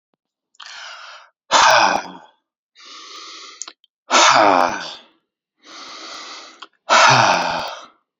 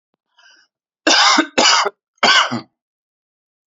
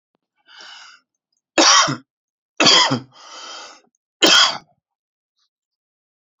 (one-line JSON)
{"exhalation_length": "8.2 s", "exhalation_amplitude": 32624, "exhalation_signal_mean_std_ratio": 0.43, "cough_length": "3.7 s", "cough_amplitude": 32767, "cough_signal_mean_std_ratio": 0.44, "three_cough_length": "6.4 s", "three_cough_amplitude": 31760, "three_cough_signal_mean_std_ratio": 0.34, "survey_phase": "beta (2021-08-13 to 2022-03-07)", "age": "18-44", "gender": "Male", "wearing_mask": "No", "symptom_none": true, "smoker_status": "Current smoker (e-cigarettes or vapes only)", "respiratory_condition_asthma": true, "respiratory_condition_other": false, "recruitment_source": "REACT", "submission_delay": "3 days", "covid_test_result": "Negative", "covid_test_method": "RT-qPCR", "influenza_a_test_result": "Negative", "influenza_b_test_result": "Negative"}